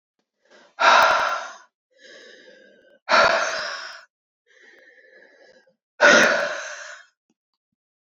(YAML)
exhalation_length: 8.1 s
exhalation_amplitude: 28165
exhalation_signal_mean_std_ratio: 0.38
survey_phase: beta (2021-08-13 to 2022-03-07)
age: 18-44
gender: Female
wearing_mask: 'No'
symptom_cough_any: true
symptom_new_continuous_cough: true
symptom_runny_or_blocked_nose: true
symptom_sore_throat: true
symptom_fever_high_temperature: true
symptom_headache: true
symptom_change_to_sense_of_smell_or_taste: true
symptom_loss_of_taste: true
symptom_onset: 3 days
smoker_status: Ex-smoker
respiratory_condition_asthma: false
respiratory_condition_other: false
recruitment_source: Test and Trace
submission_delay: 2 days
covid_test_result: Positive
covid_test_method: RT-qPCR
covid_ct_value: 23.0
covid_ct_gene: ORF1ab gene
covid_ct_mean: 23.6
covid_viral_load: 18000 copies/ml
covid_viral_load_category: Low viral load (10K-1M copies/ml)